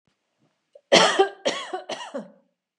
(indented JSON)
{
  "cough_length": "2.8 s",
  "cough_amplitude": 28281,
  "cough_signal_mean_std_ratio": 0.36,
  "survey_phase": "beta (2021-08-13 to 2022-03-07)",
  "age": "45-64",
  "gender": "Female",
  "wearing_mask": "No",
  "symptom_none": true,
  "smoker_status": "Never smoked",
  "respiratory_condition_asthma": false,
  "respiratory_condition_other": false,
  "recruitment_source": "REACT",
  "submission_delay": "1 day",
  "covid_test_result": "Negative",
  "covid_test_method": "RT-qPCR",
  "influenza_a_test_result": "Negative",
  "influenza_b_test_result": "Negative"
}